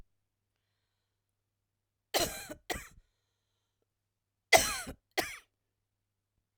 {"three_cough_length": "6.6 s", "three_cough_amplitude": 13780, "three_cough_signal_mean_std_ratio": 0.21, "survey_phase": "alpha (2021-03-01 to 2021-08-12)", "age": "45-64", "gender": "Female", "wearing_mask": "No", "symptom_fatigue": true, "symptom_onset": "12 days", "smoker_status": "Never smoked", "respiratory_condition_asthma": true, "respiratory_condition_other": false, "recruitment_source": "REACT", "submission_delay": "2 days", "covid_test_result": "Negative", "covid_test_method": "RT-qPCR"}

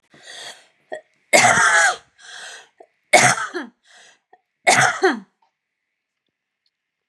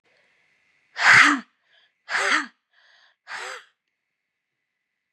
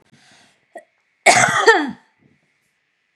{"three_cough_length": "7.1 s", "three_cough_amplitude": 32768, "three_cough_signal_mean_std_ratio": 0.38, "exhalation_length": "5.1 s", "exhalation_amplitude": 27996, "exhalation_signal_mean_std_ratio": 0.29, "cough_length": "3.2 s", "cough_amplitude": 32768, "cough_signal_mean_std_ratio": 0.34, "survey_phase": "beta (2021-08-13 to 2022-03-07)", "age": "45-64", "gender": "Female", "wearing_mask": "No", "symptom_none": true, "symptom_onset": "9 days", "smoker_status": "Never smoked", "respiratory_condition_asthma": false, "respiratory_condition_other": false, "recruitment_source": "REACT", "submission_delay": "3 days", "covid_test_result": "Negative", "covid_test_method": "RT-qPCR", "influenza_a_test_result": "Negative", "influenza_b_test_result": "Negative"}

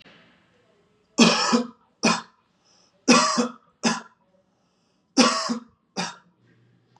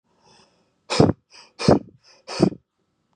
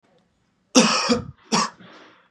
{"three_cough_length": "7.0 s", "three_cough_amplitude": 27025, "three_cough_signal_mean_std_ratio": 0.37, "exhalation_length": "3.2 s", "exhalation_amplitude": 32306, "exhalation_signal_mean_std_ratio": 0.29, "cough_length": "2.3 s", "cough_amplitude": 30476, "cough_signal_mean_std_ratio": 0.42, "survey_phase": "beta (2021-08-13 to 2022-03-07)", "age": "18-44", "gender": "Male", "wearing_mask": "No", "symptom_runny_or_blocked_nose": true, "smoker_status": "Never smoked", "respiratory_condition_asthma": false, "respiratory_condition_other": false, "recruitment_source": "REACT", "submission_delay": "3 days", "covid_test_result": "Negative", "covid_test_method": "RT-qPCR", "influenza_a_test_result": "Negative", "influenza_b_test_result": "Negative"}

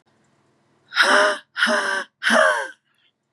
{"exhalation_length": "3.3 s", "exhalation_amplitude": 24865, "exhalation_signal_mean_std_ratio": 0.52, "survey_phase": "beta (2021-08-13 to 2022-03-07)", "age": "18-44", "gender": "Female", "wearing_mask": "No", "symptom_cough_any": true, "symptom_sore_throat": true, "symptom_onset": "5 days", "smoker_status": "Never smoked", "respiratory_condition_asthma": false, "respiratory_condition_other": false, "recruitment_source": "Test and Trace", "submission_delay": "2 days", "covid_test_result": "Negative", "covid_test_method": "RT-qPCR"}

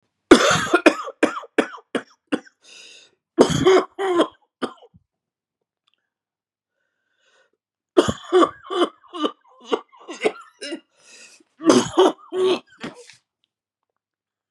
{"three_cough_length": "14.5 s", "three_cough_amplitude": 32768, "three_cough_signal_mean_std_ratio": 0.35, "survey_phase": "beta (2021-08-13 to 2022-03-07)", "age": "65+", "gender": "Male", "wearing_mask": "No", "symptom_new_continuous_cough": true, "symptom_runny_or_blocked_nose": true, "symptom_shortness_of_breath": true, "symptom_fatigue": true, "symptom_fever_high_temperature": true, "symptom_headache": true, "symptom_onset": "5 days", "smoker_status": "Never smoked", "respiratory_condition_asthma": false, "respiratory_condition_other": false, "recruitment_source": "Test and Trace", "submission_delay": "2 days", "covid_test_result": "Positive", "covid_test_method": "RT-qPCR"}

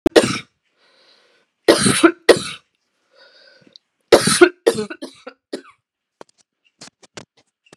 {"three_cough_length": "7.8 s", "three_cough_amplitude": 32768, "three_cough_signal_mean_std_ratio": 0.29, "survey_phase": "beta (2021-08-13 to 2022-03-07)", "age": "45-64", "gender": "Female", "wearing_mask": "No", "symptom_sore_throat": true, "symptom_fatigue": true, "symptom_headache": true, "symptom_other": true, "smoker_status": "Never smoked", "respiratory_condition_asthma": false, "respiratory_condition_other": false, "recruitment_source": "Test and Trace", "submission_delay": "1 day", "covid_test_result": "Positive", "covid_test_method": "RT-qPCR", "covid_ct_value": 38.5, "covid_ct_gene": "N gene"}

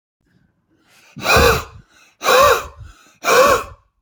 {"exhalation_length": "4.0 s", "exhalation_amplitude": 30201, "exhalation_signal_mean_std_ratio": 0.46, "survey_phase": "beta (2021-08-13 to 2022-03-07)", "age": "18-44", "gender": "Male", "wearing_mask": "No", "symptom_none": true, "smoker_status": "Never smoked", "respiratory_condition_asthma": false, "respiratory_condition_other": false, "recruitment_source": "REACT", "submission_delay": "1 day", "covid_test_result": "Negative", "covid_test_method": "RT-qPCR", "influenza_a_test_result": "Unknown/Void", "influenza_b_test_result": "Unknown/Void"}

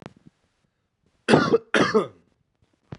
{"cough_length": "3.0 s", "cough_amplitude": 24824, "cough_signal_mean_std_ratio": 0.35, "survey_phase": "beta (2021-08-13 to 2022-03-07)", "age": "18-44", "gender": "Male", "wearing_mask": "No", "symptom_cough_any": true, "symptom_new_continuous_cough": true, "symptom_sore_throat": true, "symptom_onset": "3 days", "smoker_status": "Never smoked", "respiratory_condition_asthma": false, "respiratory_condition_other": false, "recruitment_source": "Test and Trace", "submission_delay": "2 days", "covid_test_result": "Positive", "covid_test_method": "RT-qPCR", "covid_ct_value": 18.2, "covid_ct_gene": "N gene", "covid_ct_mean": 19.1, "covid_viral_load": "560000 copies/ml", "covid_viral_load_category": "Low viral load (10K-1M copies/ml)"}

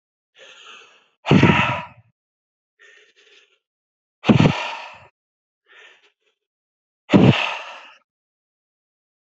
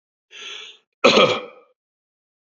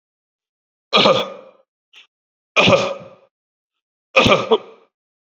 {"exhalation_length": "9.3 s", "exhalation_amplitude": 32768, "exhalation_signal_mean_std_ratio": 0.29, "cough_length": "2.5 s", "cough_amplitude": 30648, "cough_signal_mean_std_ratio": 0.32, "three_cough_length": "5.4 s", "three_cough_amplitude": 30238, "three_cough_signal_mean_std_ratio": 0.36, "survey_phase": "beta (2021-08-13 to 2022-03-07)", "age": "18-44", "gender": "Male", "wearing_mask": "No", "symptom_none": true, "smoker_status": "Ex-smoker", "respiratory_condition_asthma": false, "respiratory_condition_other": false, "recruitment_source": "REACT", "submission_delay": "1 day", "covid_test_result": "Negative", "covid_test_method": "RT-qPCR"}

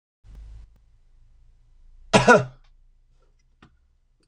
{"cough_length": "4.3 s", "cough_amplitude": 26028, "cough_signal_mean_std_ratio": 0.22, "survey_phase": "beta (2021-08-13 to 2022-03-07)", "age": "65+", "gender": "Male", "wearing_mask": "No", "symptom_cough_any": true, "smoker_status": "Never smoked", "respiratory_condition_asthma": false, "respiratory_condition_other": false, "recruitment_source": "REACT", "submission_delay": "1 day", "covid_test_result": "Negative", "covid_test_method": "RT-qPCR", "influenza_a_test_result": "Unknown/Void", "influenza_b_test_result": "Unknown/Void"}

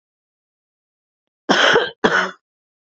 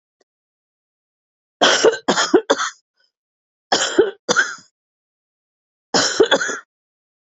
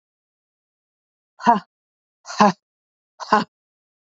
{"cough_length": "3.0 s", "cough_amplitude": 28276, "cough_signal_mean_std_ratio": 0.36, "three_cough_length": "7.3 s", "three_cough_amplitude": 31077, "three_cough_signal_mean_std_ratio": 0.38, "exhalation_length": "4.2 s", "exhalation_amplitude": 27004, "exhalation_signal_mean_std_ratio": 0.23, "survey_phase": "beta (2021-08-13 to 2022-03-07)", "age": "45-64", "gender": "Female", "wearing_mask": "No", "symptom_cough_any": true, "symptom_runny_or_blocked_nose": true, "symptom_fatigue": true, "symptom_headache": true, "symptom_change_to_sense_of_smell_or_taste": true, "symptom_onset": "4 days", "smoker_status": "Never smoked", "respiratory_condition_asthma": false, "respiratory_condition_other": false, "recruitment_source": "Test and Trace", "submission_delay": "2 days", "covid_test_result": "Positive", "covid_test_method": "RT-qPCR"}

